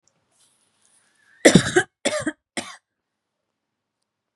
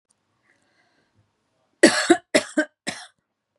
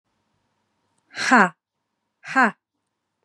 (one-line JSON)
{"cough_length": "4.4 s", "cough_amplitude": 32768, "cough_signal_mean_std_ratio": 0.23, "three_cough_length": "3.6 s", "three_cough_amplitude": 32568, "three_cough_signal_mean_std_ratio": 0.26, "exhalation_length": "3.2 s", "exhalation_amplitude": 32092, "exhalation_signal_mean_std_ratio": 0.27, "survey_phase": "beta (2021-08-13 to 2022-03-07)", "age": "45-64", "gender": "Female", "wearing_mask": "No", "symptom_none": true, "smoker_status": "Ex-smoker", "respiratory_condition_asthma": false, "respiratory_condition_other": false, "recruitment_source": "Test and Trace", "submission_delay": "0 days", "covid_test_result": "Positive", "covid_test_method": "LFT"}